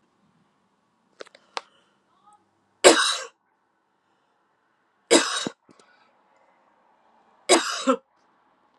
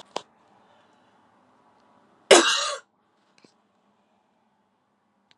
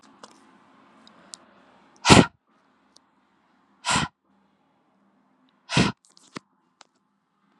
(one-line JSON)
{"three_cough_length": "8.8 s", "three_cough_amplitude": 32767, "three_cough_signal_mean_std_ratio": 0.24, "cough_length": "5.4 s", "cough_amplitude": 32157, "cough_signal_mean_std_ratio": 0.19, "exhalation_length": "7.6 s", "exhalation_amplitude": 32768, "exhalation_signal_mean_std_ratio": 0.2, "survey_phase": "alpha (2021-03-01 to 2021-08-12)", "age": "45-64", "gender": "Female", "wearing_mask": "No", "symptom_new_continuous_cough": true, "symptom_fatigue": true, "symptom_change_to_sense_of_smell_or_taste": true, "symptom_loss_of_taste": true, "symptom_onset": "4 days", "smoker_status": "Ex-smoker", "respiratory_condition_asthma": false, "respiratory_condition_other": false, "recruitment_source": "Test and Trace", "submission_delay": "2 days", "covid_test_result": "Positive", "covid_test_method": "RT-qPCR"}